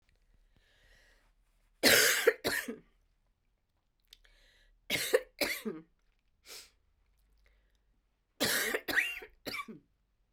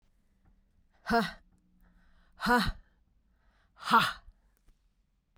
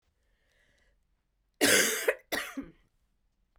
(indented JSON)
{
  "three_cough_length": "10.3 s",
  "three_cough_amplitude": 10901,
  "three_cough_signal_mean_std_ratio": 0.33,
  "exhalation_length": "5.4 s",
  "exhalation_amplitude": 9722,
  "exhalation_signal_mean_std_ratio": 0.31,
  "cough_length": "3.6 s",
  "cough_amplitude": 10081,
  "cough_signal_mean_std_ratio": 0.33,
  "survey_phase": "beta (2021-08-13 to 2022-03-07)",
  "age": "45-64",
  "gender": "Female",
  "wearing_mask": "No",
  "symptom_cough_any": true,
  "symptom_runny_or_blocked_nose": true,
  "symptom_diarrhoea": true,
  "smoker_status": "Never smoked",
  "respiratory_condition_asthma": false,
  "respiratory_condition_other": false,
  "recruitment_source": "Test and Trace",
  "submission_delay": "2 days",
  "covid_test_result": "Positive",
  "covid_test_method": "RT-qPCR"
}